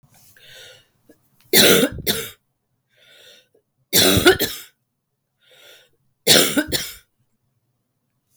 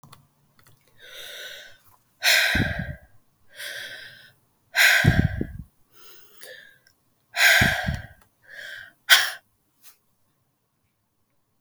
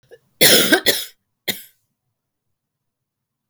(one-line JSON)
{"three_cough_length": "8.4 s", "three_cough_amplitude": 32767, "three_cough_signal_mean_std_ratio": 0.34, "exhalation_length": "11.6 s", "exhalation_amplitude": 32768, "exhalation_signal_mean_std_ratio": 0.36, "cough_length": "3.5 s", "cough_amplitude": 32768, "cough_signal_mean_std_ratio": 0.31, "survey_phase": "beta (2021-08-13 to 2022-03-07)", "age": "45-64", "gender": "Female", "wearing_mask": "No", "symptom_cough_any": true, "symptom_runny_or_blocked_nose": true, "symptom_sore_throat": true, "symptom_fatigue": true, "symptom_change_to_sense_of_smell_or_taste": true, "smoker_status": "Ex-smoker", "respiratory_condition_asthma": false, "respiratory_condition_other": false, "recruitment_source": "Test and Trace", "submission_delay": "2 days", "covid_test_method": "RT-qPCR", "covid_ct_value": 35.2, "covid_ct_gene": "ORF1ab gene"}